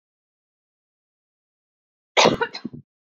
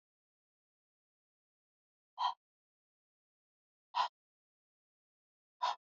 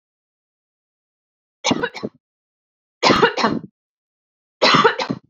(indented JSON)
{
  "cough_length": "3.2 s",
  "cough_amplitude": 26517,
  "cough_signal_mean_std_ratio": 0.22,
  "exhalation_length": "6.0 s",
  "exhalation_amplitude": 2747,
  "exhalation_signal_mean_std_ratio": 0.2,
  "three_cough_length": "5.3 s",
  "three_cough_amplitude": 29989,
  "three_cough_signal_mean_std_ratio": 0.36,
  "survey_phase": "beta (2021-08-13 to 2022-03-07)",
  "age": "18-44",
  "gender": "Female",
  "wearing_mask": "No",
  "symptom_runny_or_blocked_nose": true,
  "symptom_sore_throat": true,
  "symptom_fatigue": true,
  "symptom_headache": true,
  "symptom_onset": "13 days",
  "smoker_status": "Never smoked",
  "respiratory_condition_asthma": false,
  "respiratory_condition_other": false,
  "recruitment_source": "REACT",
  "submission_delay": "2 days",
  "covid_test_result": "Negative",
  "covid_test_method": "RT-qPCR",
  "influenza_a_test_result": "Negative",
  "influenza_b_test_result": "Negative"
}